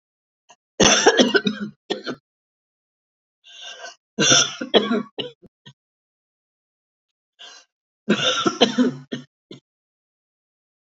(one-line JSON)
{"three_cough_length": "10.8 s", "three_cough_amplitude": 31059, "three_cough_signal_mean_std_ratio": 0.35, "survey_phase": "beta (2021-08-13 to 2022-03-07)", "age": "65+", "gender": "Female", "wearing_mask": "No", "symptom_none": true, "symptom_onset": "9 days", "smoker_status": "Never smoked", "respiratory_condition_asthma": false, "respiratory_condition_other": false, "recruitment_source": "REACT", "submission_delay": "3 days", "covid_test_result": "Negative", "covid_test_method": "RT-qPCR", "influenza_a_test_result": "Negative", "influenza_b_test_result": "Negative"}